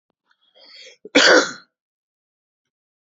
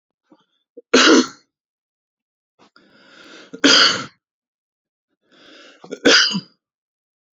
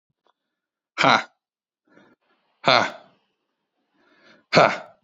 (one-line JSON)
{"cough_length": "3.2 s", "cough_amplitude": 28409, "cough_signal_mean_std_ratio": 0.26, "three_cough_length": "7.3 s", "three_cough_amplitude": 31922, "three_cough_signal_mean_std_ratio": 0.31, "exhalation_length": "5.0 s", "exhalation_amplitude": 32766, "exhalation_signal_mean_std_ratio": 0.26, "survey_phase": "alpha (2021-03-01 to 2021-08-12)", "age": "18-44", "gender": "Male", "wearing_mask": "No", "symptom_cough_any": true, "symptom_onset": "12 days", "smoker_status": "Ex-smoker", "respiratory_condition_asthma": false, "respiratory_condition_other": true, "recruitment_source": "REACT", "submission_delay": "2 days", "covid_test_result": "Negative", "covid_test_method": "RT-qPCR"}